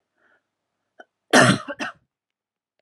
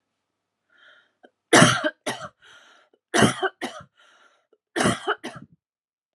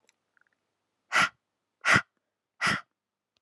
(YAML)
cough_length: 2.8 s
cough_amplitude: 31630
cough_signal_mean_std_ratio: 0.26
three_cough_length: 6.1 s
three_cough_amplitude: 29706
three_cough_signal_mean_std_ratio: 0.31
exhalation_length: 3.4 s
exhalation_amplitude: 14765
exhalation_signal_mean_std_ratio: 0.29
survey_phase: beta (2021-08-13 to 2022-03-07)
age: 18-44
gender: Female
wearing_mask: 'No'
symptom_cough_any: true
symptom_runny_or_blocked_nose: true
symptom_sore_throat: true
symptom_fatigue: true
symptom_headache: true
symptom_onset: 4 days
smoker_status: Never smoked
respiratory_condition_asthma: false
respiratory_condition_other: false
recruitment_source: REACT
submission_delay: 0 days
covid_test_result: Negative
covid_test_method: RT-qPCR